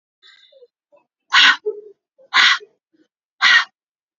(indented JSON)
{
  "exhalation_length": "4.2 s",
  "exhalation_amplitude": 32767,
  "exhalation_signal_mean_std_ratio": 0.35,
  "survey_phase": "beta (2021-08-13 to 2022-03-07)",
  "age": "45-64",
  "gender": "Female",
  "wearing_mask": "No",
  "symptom_abdominal_pain": true,
  "symptom_fatigue": true,
  "symptom_onset": "6 days",
  "smoker_status": "Ex-smoker",
  "respiratory_condition_asthma": false,
  "respiratory_condition_other": false,
  "recruitment_source": "REACT",
  "submission_delay": "2 days",
  "covid_test_result": "Negative",
  "covid_test_method": "RT-qPCR",
  "influenza_a_test_result": "Unknown/Void",
  "influenza_b_test_result": "Unknown/Void"
}